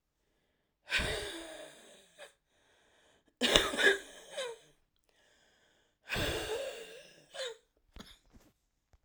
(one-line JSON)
{"exhalation_length": "9.0 s", "exhalation_amplitude": 18754, "exhalation_signal_mean_std_ratio": 0.36, "survey_phase": "alpha (2021-03-01 to 2021-08-12)", "age": "18-44", "gender": "Female", "wearing_mask": "No", "symptom_cough_any": true, "symptom_new_continuous_cough": true, "symptom_shortness_of_breath": true, "symptom_fever_high_temperature": true, "symptom_onset": "3 days", "smoker_status": "Ex-smoker", "respiratory_condition_asthma": false, "respiratory_condition_other": false, "recruitment_source": "Test and Trace", "submission_delay": "1 day", "covid_test_result": "Positive", "covid_test_method": "RT-qPCR", "covid_ct_value": 16.5, "covid_ct_gene": "ORF1ab gene", "covid_ct_mean": 16.8, "covid_viral_load": "3100000 copies/ml", "covid_viral_load_category": "High viral load (>1M copies/ml)"}